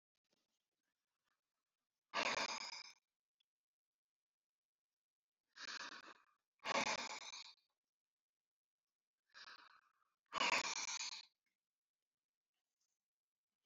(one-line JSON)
{"exhalation_length": "13.7 s", "exhalation_amplitude": 1748, "exhalation_signal_mean_std_ratio": 0.31, "survey_phase": "beta (2021-08-13 to 2022-03-07)", "age": "65+", "gender": "Male", "wearing_mask": "No", "symptom_none": true, "smoker_status": "Ex-smoker", "respiratory_condition_asthma": true, "respiratory_condition_other": false, "recruitment_source": "REACT", "submission_delay": "1 day", "covid_test_result": "Negative", "covid_test_method": "RT-qPCR"}